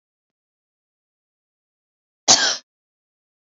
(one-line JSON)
{"cough_length": "3.5 s", "cough_amplitude": 31008, "cough_signal_mean_std_ratio": 0.2, "survey_phase": "alpha (2021-03-01 to 2021-08-12)", "age": "18-44", "gender": "Female", "wearing_mask": "No", "symptom_none": true, "symptom_onset": "8 days", "smoker_status": "Never smoked", "respiratory_condition_asthma": false, "respiratory_condition_other": false, "recruitment_source": "Test and Trace", "submission_delay": "2 days", "covid_test_result": "Positive", "covid_test_method": "RT-qPCR", "covid_ct_value": 26.5, "covid_ct_gene": "S gene", "covid_ct_mean": 26.9, "covid_viral_load": "1500 copies/ml", "covid_viral_load_category": "Minimal viral load (< 10K copies/ml)"}